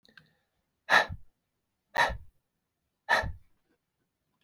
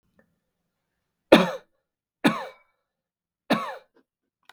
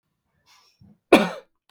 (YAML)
exhalation_length: 4.4 s
exhalation_amplitude: 14022
exhalation_signal_mean_std_ratio: 0.28
three_cough_length: 4.5 s
three_cough_amplitude: 32768
three_cough_signal_mean_std_ratio: 0.22
cough_length: 1.7 s
cough_amplitude: 32766
cough_signal_mean_std_ratio: 0.22
survey_phase: beta (2021-08-13 to 2022-03-07)
age: 45-64
gender: Male
wearing_mask: 'No'
symptom_none: true
smoker_status: Never smoked
respiratory_condition_asthma: false
respiratory_condition_other: false
recruitment_source: REACT
submission_delay: 3 days
covid_test_result: Negative
covid_test_method: RT-qPCR